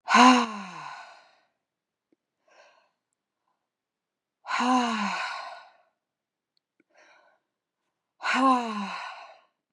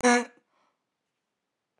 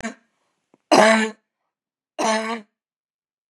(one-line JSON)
{"exhalation_length": "9.7 s", "exhalation_amplitude": 25800, "exhalation_signal_mean_std_ratio": 0.33, "cough_length": "1.8 s", "cough_amplitude": 10704, "cough_signal_mean_std_ratio": 0.27, "three_cough_length": "3.5 s", "three_cough_amplitude": 32653, "three_cough_signal_mean_std_ratio": 0.34, "survey_phase": "beta (2021-08-13 to 2022-03-07)", "age": "18-44", "gender": "Female", "wearing_mask": "No", "symptom_cough_any": true, "symptom_shortness_of_breath": true, "symptom_onset": "2 days", "smoker_status": "Never smoked", "respiratory_condition_asthma": false, "respiratory_condition_other": false, "recruitment_source": "REACT", "submission_delay": "11 days", "covid_test_result": "Negative", "covid_test_method": "RT-qPCR", "influenza_a_test_result": "Unknown/Void", "influenza_b_test_result": "Unknown/Void"}